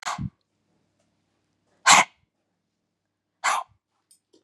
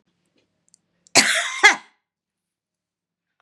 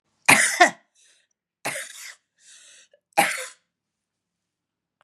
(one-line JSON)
{"exhalation_length": "4.4 s", "exhalation_amplitude": 32336, "exhalation_signal_mean_std_ratio": 0.23, "cough_length": "3.4 s", "cough_amplitude": 32767, "cough_signal_mean_std_ratio": 0.26, "three_cough_length": "5.0 s", "three_cough_amplitude": 32767, "three_cough_signal_mean_std_ratio": 0.27, "survey_phase": "beta (2021-08-13 to 2022-03-07)", "age": "65+", "gender": "Female", "wearing_mask": "No", "symptom_cough_any": true, "symptom_runny_or_blocked_nose": true, "symptom_diarrhoea": true, "symptom_fatigue": true, "symptom_change_to_sense_of_smell_or_taste": true, "symptom_loss_of_taste": true, "symptom_onset": "3 days", "smoker_status": "Never smoked", "respiratory_condition_asthma": false, "respiratory_condition_other": false, "recruitment_source": "Test and Trace", "submission_delay": "2 days", "covid_test_result": "Positive", "covid_test_method": "RT-qPCR", "covid_ct_value": 17.9, "covid_ct_gene": "N gene", "covid_ct_mean": 18.2, "covid_viral_load": "1100000 copies/ml", "covid_viral_load_category": "High viral load (>1M copies/ml)"}